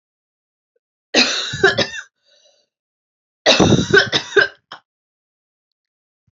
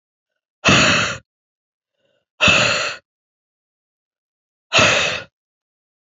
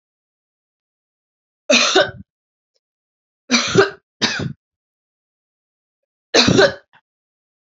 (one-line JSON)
{"cough_length": "6.3 s", "cough_amplitude": 31435, "cough_signal_mean_std_ratio": 0.36, "exhalation_length": "6.1 s", "exhalation_amplitude": 30517, "exhalation_signal_mean_std_ratio": 0.39, "three_cough_length": "7.7 s", "three_cough_amplitude": 32213, "three_cough_signal_mean_std_ratio": 0.32, "survey_phase": "alpha (2021-03-01 to 2021-08-12)", "age": "18-44", "gender": "Female", "wearing_mask": "No", "symptom_cough_any": true, "symptom_shortness_of_breath": true, "symptom_fatigue": true, "symptom_fever_high_temperature": true, "symptom_headache": true, "symptom_change_to_sense_of_smell_or_taste": true, "symptom_loss_of_taste": true, "symptom_onset": "2 days", "smoker_status": "Ex-smoker", "respiratory_condition_asthma": false, "respiratory_condition_other": false, "recruitment_source": "Test and Trace", "submission_delay": "2 days", "covid_test_result": "Positive", "covid_test_method": "RT-qPCR", "covid_ct_value": 13.5, "covid_ct_gene": "ORF1ab gene", "covid_ct_mean": 13.7, "covid_viral_load": "32000000 copies/ml", "covid_viral_load_category": "High viral load (>1M copies/ml)"}